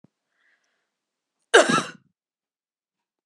{"cough_length": "3.3 s", "cough_amplitude": 31289, "cough_signal_mean_std_ratio": 0.21, "survey_phase": "beta (2021-08-13 to 2022-03-07)", "age": "45-64", "gender": "Female", "wearing_mask": "No", "symptom_runny_or_blocked_nose": true, "symptom_sore_throat": true, "smoker_status": "Ex-smoker", "respiratory_condition_asthma": false, "respiratory_condition_other": false, "recruitment_source": "Test and Trace", "submission_delay": "0 days", "covid_test_result": "Positive", "covid_test_method": "LFT"}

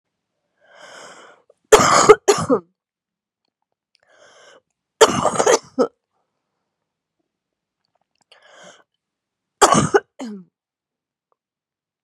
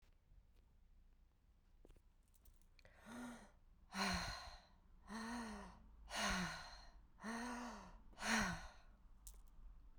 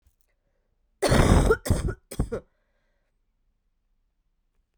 {"three_cough_length": "12.0 s", "three_cough_amplitude": 32768, "three_cough_signal_mean_std_ratio": 0.27, "exhalation_length": "10.0 s", "exhalation_amplitude": 1886, "exhalation_signal_mean_std_ratio": 0.55, "cough_length": "4.8 s", "cough_amplitude": 20247, "cough_signal_mean_std_ratio": 0.34, "survey_phase": "beta (2021-08-13 to 2022-03-07)", "age": "18-44", "gender": "Female", "wearing_mask": "Yes", "symptom_cough_any": true, "symptom_new_continuous_cough": true, "symptom_runny_or_blocked_nose": true, "symptom_fatigue": true, "symptom_headache": true, "symptom_change_to_sense_of_smell_or_taste": true, "symptom_loss_of_taste": true, "symptom_onset": "4 days", "smoker_status": "Current smoker (1 to 10 cigarettes per day)", "respiratory_condition_asthma": false, "respiratory_condition_other": false, "recruitment_source": "Test and Trace", "submission_delay": "2 days", "covid_test_result": "Positive", "covid_test_method": "RT-qPCR", "covid_ct_value": 29.5, "covid_ct_gene": "N gene"}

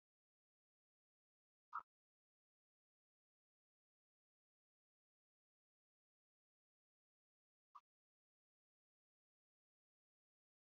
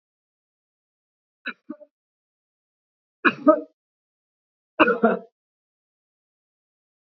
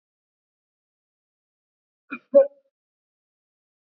{"exhalation_length": "10.7 s", "exhalation_amplitude": 464, "exhalation_signal_mean_std_ratio": 0.07, "three_cough_length": "7.1 s", "three_cough_amplitude": 28200, "three_cough_signal_mean_std_ratio": 0.21, "cough_length": "3.9 s", "cough_amplitude": 19248, "cough_signal_mean_std_ratio": 0.14, "survey_phase": "beta (2021-08-13 to 2022-03-07)", "age": "65+", "gender": "Female", "wearing_mask": "No", "symptom_none": true, "smoker_status": "Never smoked", "respiratory_condition_asthma": false, "respiratory_condition_other": false, "recruitment_source": "REACT", "submission_delay": "3 days", "covid_test_result": "Negative", "covid_test_method": "RT-qPCR", "influenza_a_test_result": "Negative", "influenza_b_test_result": "Negative"}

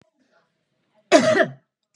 {"cough_length": "2.0 s", "cough_amplitude": 30966, "cough_signal_mean_std_ratio": 0.33, "survey_phase": "beta (2021-08-13 to 2022-03-07)", "age": "45-64", "gender": "Female", "wearing_mask": "No", "symptom_none": true, "symptom_onset": "13 days", "smoker_status": "Ex-smoker", "respiratory_condition_asthma": false, "respiratory_condition_other": false, "recruitment_source": "REACT", "submission_delay": "4 days", "covid_test_result": "Negative", "covid_test_method": "RT-qPCR", "influenza_a_test_result": "Negative", "influenza_b_test_result": "Negative"}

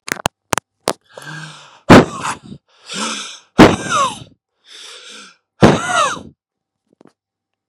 {"exhalation_length": "7.7 s", "exhalation_amplitude": 32768, "exhalation_signal_mean_std_ratio": 0.33, "survey_phase": "beta (2021-08-13 to 2022-03-07)", "age": "18-44", "gender": "Male", "wearing_mask": "No", "symptom_shortness_of_breath": true, "symptom_fatigue": true, "smoker_status": "Ex-smoker", "respiratory_condition_asthma": false, "respiratory_condition_other": false, "recruitment_source": "REACT", "submission_delay": "1 day", "covid_test_result": "Negative", "covid_test_method": "RT-qPCR", "influenza_a_test_result": "Negative", "influenza_b_test_result": "Negative"}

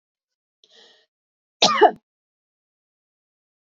{"cough_length": "3.7 s", "cough_amplitude": 28355, "cough_signal_mean_std_ratio": 0.2, "survey_phase": "beta (2021-08-13 to 2022-03-07)", "age": "18-44", "gender": "Female", "wearing_mask": "No", "symptom_none": true, "smoker_status": "Never smoked", "respiratory_condition_asthma": false, "respiratory_condition_other": false, "recruitment_source": "REACT", "submission_delay": "2 days", "covid_test_result": "Negative", "covid_test_method": "RT-qPCR"}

